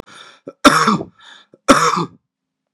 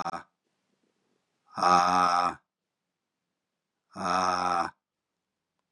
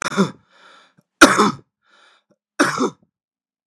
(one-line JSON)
{"cough_length": "2.7 s", "cough_amplitude": 32768, "cough_signal_mean_std_ratio": 0.4, "exhalation_length": "5.7 s", "exhalation_amplitude": 14483, "exhalation_signal_mean_std_ratio": 0.4, "three_cough_length": "3.7 s", "three_cough_amplitude": 32768, "three_cough_signal_mean_std_ratio": 0.32, "survey_phase": "beta (2021-08-13 to 2022-03-07)", "age": "45-64", "gender": "Male", "wearing_mask": "No", "symptom_cough_any": true, "symptom_sore_throat": true, "symptom_headache": true, "symptom_onset": "3 days", "smoker_status": "Never smoked", "respiratory_condition_asthma": false, "respiratory_condition_other": false, "recruitment_source": "Test and Trace", "submission_delay": "2 days", "covid_test_result": "Positive", "covid_test_method": "RT-qPCR", "covid_ct_value": 18.1, "covid_ct_gene": "ORF1ab gene", "covid_ct_mean": 18.1, "covid_viral_load": "1100000 copies/ml", "covid_viral_load_category": "High viral load (>1M copies/ml)"}